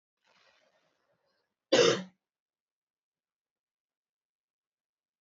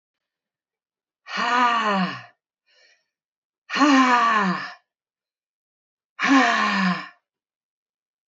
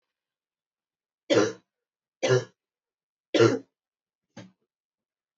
{"cough_length": "5.2 s", "cough_amplitude": 8888, "cough_signal_mean_std_ratio": 0.18, "exhalation_length": "8.3 s", "exhalation_amplitude": 20033, "exhalation_signal_mean_std_ratio": 0.47, "three_cough_length": "5.4 s", "three_cough_amplitude": 13917, "three_cough_signal_mean_std_ratio": 0.27, "survey_phase": "beta (2021-08-13 to 2022-03-07)", "age": "18-44", "gender": "Female", "wearing_mask": "No", "symptom_cough_any": true, "symptom_runny_or_blocked_nose": true, "symptom_sore_throat": true, "symptom_fatigue": true, "symptom_fever_high_temperature": true, "symptom_headache": true, "symptom_change_to_sense_of_smell_or_taste": true, "symptom_loss_of_taste": true, "symptom_other": true, "smoker_status": "Never smoked", "respiratory_condition_asthma": false, "respiratory_condition_other": false, "recruitment_source": "Test and Trace", "submission_delay": "2 days", "covid_test_result": "Positive", "covid_test_method": "RT-qPCR"}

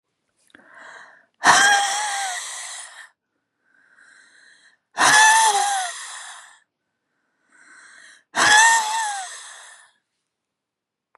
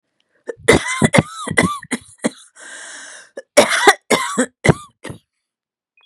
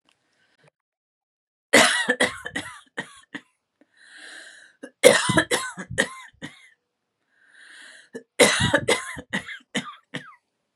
{"exhalation_length": "11.2 s", "exhalation_amplitude": 29425, "exhalation_signal_mean_std_ratio": 0.41, "cough_length": "6.1 s", "cough_amplitude": 32768, "cough_signal_mean_std_ratio": 0.39, "three_cough_length": "10.8 s", "three_cough_amplitude": 32768, "three_cough_signal_mean_std_ratio": 0.34, "survey_phase": "beta (2021-08-13 to 2022-03-07)", "age": "65+", "gender": "Female", "wearing_mask": "No", "symptom_cough_any": true, "symptom_runny_or_blocked_nose": true, "smoker_status": "Ex-smoker", "respiratory_condition_asthma": false, "respiratory_condition_other": false, "recruitment_source": "Test and Trace", "submission_delay": "2 days", "covid_test_result": "Positive", "covid_test_method": "LFT"}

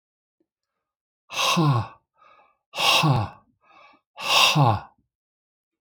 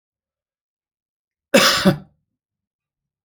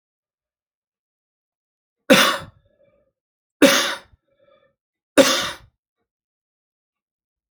{"exhalation_length": "5.8 s", "exhalation_amplitude": 24008, "exhalation_signal_mean_std_ratio": 0.44, "cough_length": "3.2 s", "cough_amplitude": 28462, "cough_signal_mean_std_ratio": 0.27, "three_cough_length": "7.5 s", "three_cough_amplitude": 29528, "three_cough_signal_mean_std_ratio": 0.25, "survey_phase": "alpha (2021-03-01 to 2021-08-12)", "age": "45-64", "gender": "Male", "wearing_mask": "No", "symptom_cough_any": true, "symptom_onset": "12 days", "smoker_status": "Never smoked", "respiratory_condition_asthma": false, "respiratory_condition_other": false, "recruitment_source": "REACT", "submission_delay": "2 days", "covid_test_result": "Negative", "covid_test_method": "RT-qPCR"}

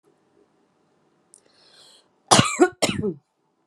{"cough_length": "3.7 s", "cough_amplitude": 32767, "cough_signal_mean_std_ratio": 0.28, "survey_phase": "beta (2021-08-13 to 2022-03-07)", "age": "18-44", "gender": "Female", "wearing_mask": "No", "symptom_none": true, "symptom_onset": "4 days", "smoker_status": "Never smoked", "respiratory_condition_asthma": false, "respiratory_condition_other": false, "recruitment_source": "REACT", "submission_delay": "1 day", "covid_test_result": "Negative", "covid_test_method": "RT-qPCR"}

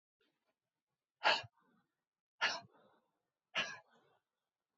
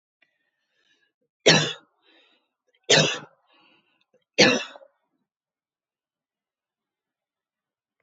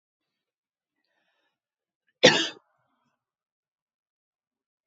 {"exhalation_length": "4.8 s", "exhalation_amplitude": 4059, "exhalation_signal_mean_std_ratio": 0.24, "three_cough_length": "8.0 s", "three_cough_amplitude": 27638, "three_cough_signal_mean_std_ratio": 0.23, "cough_length": "4.9 s", "cough_amplitude": 27724, "cough_signal_mean_std_ratio": 0.15, "survey_phase": "beta (2021-08-13 to 2022-03-07)", "age": "45-64", "gender": "Female", "wearing_mask": "No", "symptom_shortness_of_breath": true, "symptom_onset": "10 days", "smoker_status": "Ex-smoker", "respiratory_condition_asthma": false, "respiratory_condition_other": false, "recruitment_source": "REACT", "submission_delay": "1 day", "covid_test_result": "Negative", "covid_test_method": "RT-qPCR"}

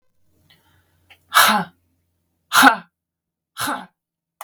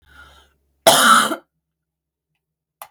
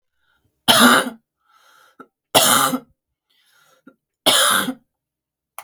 {"exhalation_length": "4.4 s", "exhalation_amplitude": 32768, "exhalation_signal_mean_std_ratio": 0.29, "cough_length": "2.9 s", "cough_amplitude": 32768, "cough_signal_mean_std_ratio": 0.33, "three_cough_length": "5.6 s", "three_cough_amplitude": 32768, "three_cough_signal_mean_std_ratio": 0.38, "survey_phase": "beta (2021-08-13 to 2022-03-07)", "age": "45-64", "gender": "Female", "wearing_mask": "No", "symptom_cough_any": true, "symptom_sore_throat": true, "symptom_fatigue": true, "symptom_headache": true, "symptom_onset": "12 days", "smoker_status": "Never smoked", "respiratory_condition_asthma": false, "respiratory_condition_other": false, "recruitment_source": "REACT", "submission_delay": "0 days", "covid_test_result": "Negative", "covid_test_method": "RT-qPCR", "influenza_a_test_result": "Negative", "influenza_b_test_result": "Negative"}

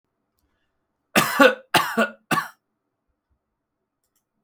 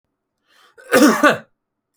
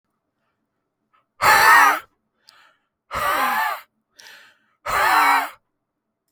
{"three_cough_length": "4.4 s", "three_cough_amplitude": 29246, "three_cough_signal_mean_std_ratio": 0.3, "cough_length": "2.0 s", "cough_amplitude": 29766, "cough_signal_mean_std_ratio": 0.38, "exhalation_length": "6.3 s", "exhalation_amplitude": 26646, "exhalation_signal_mean_std_ratio": 0.42, "survey_phase": "beta (2021-08-13 to 2022-03-07)", "age": "18-44", "gender": "Male", "wearing_mask": "No", "symptom_none": true, "smoker_status": "Ex-smoker", "respiratory_condition_asthma": false, "respiratory_condition_other": false, "recruitment_source": "REACT", "submission_delay": "2 days", "covid_test_result": "Negative", "covid_test_method": "RT-qPCR"}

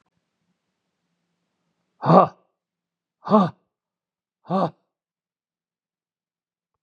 {"exhalation_length": "6.8 s", "exhalation_amplitude": 29747, "exhalation_signal_mean_std_ratio": 0.21, "survey_phase": "beta (2021-08-13 to 2022-03-07)", "age": "65+", "gender": "Male", "wearing_mask": "No", "symptom_runny_or_blocked_nose": true, "smoker_status": "Never smoked", "respiratory_condition_asthma": false, "respiratory_condition_other": false, "recruitment_source": "REACT", "submission_delay": "1 day", "covid_test_result": "Negative", "covid_test_method": "RT-qPCR", "influenza_a_test_result": "Negative", "influenza_b_test_result": "Negative"}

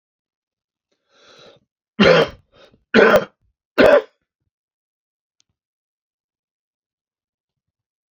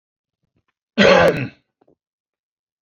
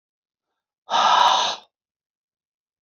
{"three_cough_length": "8.1 s", "three_cough_amplitude": 28495, "three_cough_signal_mean_std_ratio": 0.26, "cough_length": "2.8 s", "cough_amplitude": 28063, "cough_signal_mean_std_ratio": 0.32, "exhalation_length": "2.8 s", "exhalation_amplitude": 20486, "exhalation_signal_mean_std_ratio": 0.39, "survey_phase": "beta (2021-08-13 to 2022-03-07)", "age": "45-64", "gender": "Male", "wearing_mask": "No", "symptom_cough_any": true, "symptom_runny_or_blocked_nose": true, "symptom_sore_throat": true, "symptom_fatigue": true, "symptom_onset": "3 days", "smoker_status": "Never smoked", "respiratory_condition_asthma": false, "respiratory_condition_other": false, "recruitment_source": "Test and Trace", "submission_delay": "2 days", "covid_test_result": "Positive", "covid_test_method": "ePCR"}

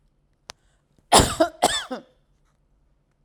{"cough_length": "3.2 s", "cough_amplitude": 32767, "cough_signal_mean_std_ratio": 0.29, "survey_phase": "alpha (2021-03-01 to 2021-08-12)", "age": "65+", "gender": "Female", "wearing_mask": "No", "symptom_none": true, "smoker_status": "Never smoked", "respiratory_condition_asthma": false, "respiratory_condition_other": false, "recruitment_source": "REACT", "submission_delay": "1 day", "covid_test_result": "Negative", "covid_test_method": "RT-qPCR"}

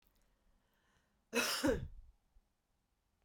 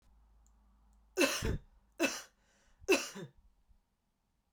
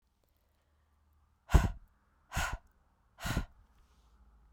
{"cough_length": "3.2 s", "cough_amplitude": 2587, "cough_signal_mean_std_ratio": 0.34, "three_cough_length": "4.5 s", "three_cough_amplitude": 5369, "three_cough_signal_mean_std_ratio": 0.33, "exhalation_length": "4.5 s", "exhalation_amplitude": 12240, "exhalation_signal_mean_std_ratio": 0.25, "survey_phase": "beta (2021-08-13 to 2022-03-07)", "age": "18-44", "gender": "Female", "wearing_mask": "No", "symptom_cough_any": true, "symptom_shortness_of_breath": true, "symptom_fatigue": true, "symptom_change_to_sense_of_smell_or_taste": true, "symptom_other": true, "symptom_onset": "3 days", "smoker_status": "Current smoker (e-cigarettes or vapes only)", "respiratory_condition_asthma": false, "respiratory_condition_other": false, "recruitment_source": "Test and Trace", "submission_delay": "2 days", "covid_test_result": "Positive", "covid_test_method": "RT-qPCR", "covid_ct_value": 15.9, "covid_ct_gene": "ORF1ab gene"}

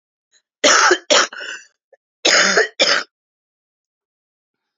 {"cough_length": "4.8 s", "cough_amplitude": 32768, "cough_signal_mean_std_ratio": 0.41, "survey_phase": "alpha (2021-03-01 to 2021-08-12)", "age": "45-64", "gender": "Female", "wearing_mask": "No", "symptom_cough_any": true, "symptom_shortness_of_breath": true, "symptom_fatigue": true, "symptom_headache": true, "symptom_onset": "4 days", "smoker_status": "Never smoked", "respiratory_condition_asthma": true, "respiratory_condition_other": false, "recruitment_source": "Test and Trace", "submission_delay": "2 days", "covid_test_result": "Positive", "covid_test_method": "RT-qPCR", "covid_ct_value": 27.4, "covid_ct_gene": "ORF1ab gene"}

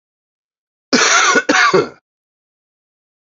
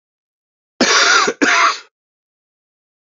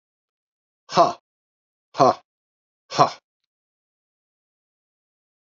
{"cough_length": "3.3 s", "cough_amplitude": 31702, "cough_signal_mean_std_ratio": 0.43, "three_cough_length": "3.2 s", "three_cough_amplitude": 32768, "three_cough_signal_mean_std_ratio": 0.45, "exhalation_length": "5.5 s", "exhalation_amplitude": 27358, "exhalation_signal_mean_std_ratio": 0.21, "survey_phase": "beta (2021-08-13 to 2022-03-07)", "age": "45-64", "gender": "Male", "wearing_mask": "No", "symptom_cough_any": true, "symptom_runny_or_blocked_nose": true, "symptom_shortness_of_breath": true, "symptom_sore_throat": true, "symptom_fatigue": true, "symptom_fever_high_temperature": true, "symptom_headache": true, "symptom_change_to_sense_of_smell_or_taste": true, "symptom_loss_of_taste": true, "symptom_onset": "4 days", "smoker_status": "Never smoked", "respiratory_condition_asthma": false, "respiratory_condition_other": false, "recruitment_source": "Test and Trace", "submission_delay": "1 day", "covid_test_result": "Positive", "covid_test_method": "RT-qPCR"}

